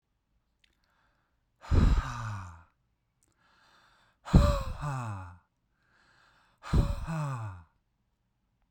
{
  "exhalation_length": "8.7 s",
  "exhalation_amplitude": 16476,
  "exhalation_signal_mean_std_ratio": 0.35,
  "survey_phase": "beta (2021-08-13 to 2022-03-07)",
  "age": "18-44",
  "gender": "Male",
  "wearing_mask": "No",
  "symptom_none": true,
  "smoker_status": "Never smoked",
  "respiratory_condition_asthma": false,
  "respiratory_condition_other": false,
  "recruitment_source": "REACT",
  "submission_delay": "2 days",
  "covid_test_result": "Negative",
  "covid_test_method": "RT-qPCR"
}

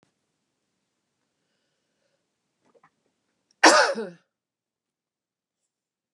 {
  "cough_length": "6.1 s",
  "cough_amplitude": 26699,
  "cough_signal_mean_std_ratio": 0.18,
  "survey_phase": "beta (2021-08-13 to 2022-03-07)",
  "age": "65+",
  "gender": "Female",
  "wearing_mask": "No",
  "symptom_none": true,
  "smoker_status": "Ex-smoker",
  "respiratory_condition_asthma": false,
  "respiratory_condition_other": false,
  "recruitment_source": "REACT",
  "submission_delay": "2 days",
  "covid_test_result": "Negative",
  "covid_test_method": "RT-qPCR"
}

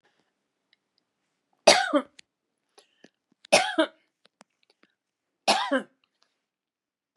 {
  "three_cough_length": "7.2 s",
  "three_cough_amplitude": 27896,
  "three_cough_signal_mean_std_ratio": 0.25,
  "survey_phase": "beta (2021-08-13 to 2022-03-07)",
  "age": "65+",
  "gender": "Female",
  "wearing_mask": "No",
  "symptom_none": true,
  "smoker_status": "Never smoked",
  "respiratory_condition_asthma": false,
  "respiratory_condition_other": false,
  "recruitment_source": "REACT",
  "submission_delay": "2 days",
  "covid_test_result": "Negative",
  "covid_test_method": "RT-qPCR",
  "influenza_a_test_result": "Negative",
  "influenza_b_test_result": "Negative"
}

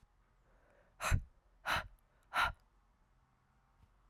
{
  "exhalation_length": "4.1 s",
  "exhalation_amplitude": 3605,
  "exhalation_signal_mean_std_ratio": 0.31,
  "survey_phase": "alpha (2021-03-01 to 2021-08-12)",
  "age": "18-44",
  "gender": "Female",
  "wearing_mask": "No",
  "symptom_new_continuous_cough": true,
  "symptom_fatigue": true,
  "symptom_headache": true,
  "symptom_onset": "5 days",
  "smoker_status": "Never smoked",
  "respiratory_condition_asthma": false,
  "respiratory_condition_other": false,
  "recruitment_source": "Test and Trace",
  "submission_delay": "2 days",
  "covid_test_result": "Positive",
  "covid_test_method": "RT-qPCR"
}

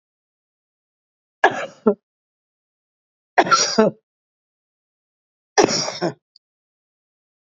{
  "three_cough_length": "7.6 s",
  "three_cough_amplitude": 32767,
  "three_cough_signal_mean_std_ratio": 0.27,
  "survey_phase": "beta (2021-08-13 to 2022-03-07)",
  "age": "65+",
  "gender": "Female",
  "wearing_mask": "No",
  "symptom_none": true,
  "smoker_status": "Current smoker (1 to 10 cigarettes per day)",
  "respiratory_condition_asthma": false,
  "respiratory_condition_other": false,
  "recruitment_source": "REACT",
  "submission_delay": "2 days",
  "covid_test_result": "Negative",
  "covid_test_method": "RT-qPCR",
  "influenza_a_test_result": "Negative",
  "influenza_b_test_result": "Negative"
}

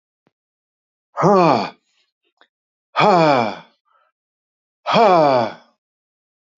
{
  "exhalation_length": "6.6 s",
  "exhalation_amplitude": 28371,
  "exhalation_signal_mean_std_ratio": 0.39,
  "survey_phase": "alpha (2021-03-01 to 2021-08-12)",
  "age": "65+",
  "gender": "Male",
  "wearing_mask": "No",
  "symptom_none": true,
  "smoker_status": "Ex-smoker",
  "respiratory_condition_asthma": false,
  "respiratory_condition_other": false,
  "recruitment_source": "REACT",
  "submission_delay": "2 days",
  "covid_test_result": "Negative",
  "covid_test_method": "RT-qPCR"
}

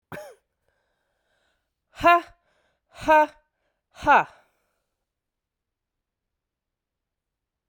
{
  "exhalation_length": "7.7 s",
  "exhalation_amplitude": 16307,
  "exhalation_signal_mean_std_ratio": 0.22,
  "survey_phase": "beta (2021-08-13 to 2022-03-07)",
  "age": "45-64",
  "gender": "Female",
  "wearing_mask": "No",
  "symptom_cough_any": true,
  "symptom_runny_or_blocked_nose": true,
  "symptom_sore_throat": true,
  "symptom_fatigue": true,
  "symptom_fever_high_temperature": true,
  "symptom_headache": true,
  "symptom_change_to_sense_of_smell_or_taste": true,
  "smoker_status": "Ex-smoker",
  "respiratory_condition_asthma": true,
  "respiratory_condition_other": false,
  "recruitment_source": "Test and Trace",
  "submission_delay": "1 day",
  "covid_test_result": "Positive",
  "covid_test_method": "ePCR"
}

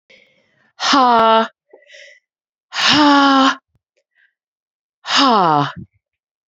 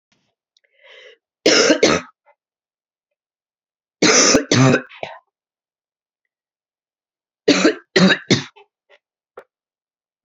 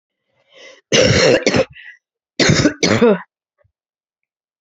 {
  "exhalation_length": "6.5 s",
  "exhalation_amplitude": 31226,
  "exhalation_signal_mean_std_ratio": 0.47,
  "three_cough_length": "10.2 s",
  "three_cough_amplitude": 32419,
  "three_cough_signal_mean_std_ratio": 0.34,
  "cough_length": "4.6 s",
  "cough_amplitude": 32767,
  "cough_signal_mean_std_ratio": 0.46,
  "survey_phase": "beta (2021-08-13 to 2022-03-07)",
  "age": "45-64",
  "gender": "Female",
  "wearing_mask": "No",
  "symptom_cough_any": true,
  "symptom_runny_or_blocked_nose": true,
  "symptom_headache": true,
  "symptom_other": true,
  "symptom_onset": "3 days",
  "smoker_status": "Never smoked",
  "respiratory_condition_asthma": false,
  "respiratory_condition_other": false,
  "recruitment_source": "Test and Trace",
  "submission_delay": "2 days",
  "covid_test_result": "Positive",
  "covid_test_method": "RT-qPCR",
  "covid_ct_value": 27.1,
  "covid_ct_gene": "ORF1ab gene"
}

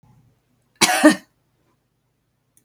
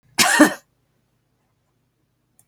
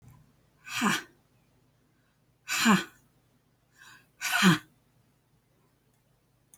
{
  "three_cough_length": "2.6 s",
  "three_cough_amplitude": 32768,
  "three_cough_signal_mean_std_ratio": 0.26,
  "cough_length": "2.5 s",
  "cough_amplitude": 29444,
  "cough_signal_mean_std_ratio": 0.28,
  "exhalation_length": "6.6 s",
  "exhalation_amplitude": 12045,
  "exhalation_signal_mean_std_ratio": 0.3,
  "survey_phase": "alpha (2021-03-01 to 2021-08-12)",
  "age": "45-64",
  "gender": "Female",
  "wearing_mask": "No",
  "symptom_none": true,
  "smoker_status": "Never smoked",
  "respiratory_condition_asthma": false,
  "respiratory_condition_other": false,
  "recruitment_source": "REACT",
  "submission_delay": "4 days",
  "covid_test_result": "Negative",
  "covid_test_method": "RT-qPCR"
}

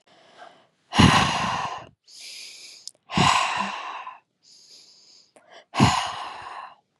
{
  "exhalation_length": "7.0 s",
  "exhalation_amplitude": 28082,
  "exhalation_signal_mean_std_ratio": 0.43,
  "survey_phase": "beta (2021-08-13 to 2022-03-07)",
  "age": "45-64",
  "gender": "Female",
  "wearing_mask": "No",
  "symptom_cough_any": true,
  "symptom_abdominal_pain": true,
  "symptom_headache": true,
  "symptom_onset": "12 days",
  "smoker_status": "Never smoked",
  "respiratory_condition_asthma": false,
  "respiratory_condition_other": false,
  "recruitment_source": "REACT",
  "submission_delay": "1 day",
  "covid_test_result": "Negative",
  "covid_test_method": "RT-qPCR",
  "influenza_a_test_result": "Negative",
  "influenza_b_test_result": "Negative"
}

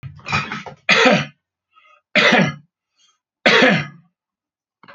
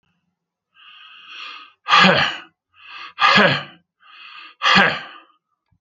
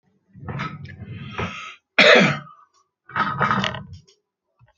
{
  "three_cough_length": "4.9 s",
  "three_cough_amplitude": 32720,
  "three_cough_signal_mean_std_ratio": 0.43,
  "exhalation_length": "5.8 s",
  "exhalation_amplitude": 29827,
  "exhalation_signal_mean_std_ratio": 0.39,
  "cough_length": "4.8 s",
  "cough_amplitude": 30353,
  "cough_signal_mean_std_ratio": 0.4,
  "survey_phase": "alpha (2021-03-01 to 2021-08-12)",
  "age": "65+",
  "gender": "Male",
  "wearing_mask": "No",
  "symptom_none": true,
  "smoker_status": "Ex-smoker",
  "respiratory_condition_asthma": false,
  "respiratory_condition_other": false,
  "recruitment_source": "REACT",
  "submission_delay": "8 days",
  "covid_test_result": "Negative",
  "covid_test_method": "RT-qPCR"
}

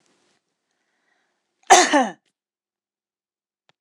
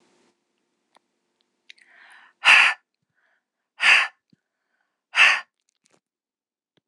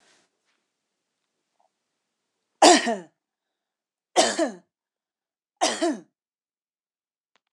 {
  "cough_length": "3.8 s",
  "cough_amplitude": 26028,
  "cough_signal_mean_std_ratio": 0.23,
  "exhalation_length": "6.9 s",
  "exhalation_amplitude": 26028,
  "exhalation_signal_mean_std_ratio": 0.26,
  "three_cough_length": "7.5 s",
  "three_cough_amplitude": 25654,
  "three_cough_signal_mean_std_ratio": 0.24,
  "survey_phase": "beta (2021-08-13 to 2022-03-07)",
  "age": "65+",
  "gender": "Female",
  "wearing_mask": "No",
  "symptom_none": true,
  "smoker_status": "Ex-smoker",
  "respiratory_condition_asthma": false,
  "respiratory_condition_other": false,
  "recruitment_source": "REACT",
  "submission_delay": "1 day",
  "covid_test_result": "Negative",
  "covid_test_method": "RT-qPCR",
  "influenza_a_test_result": "Negative",
  "influenza_b_test_result": "Negative"
}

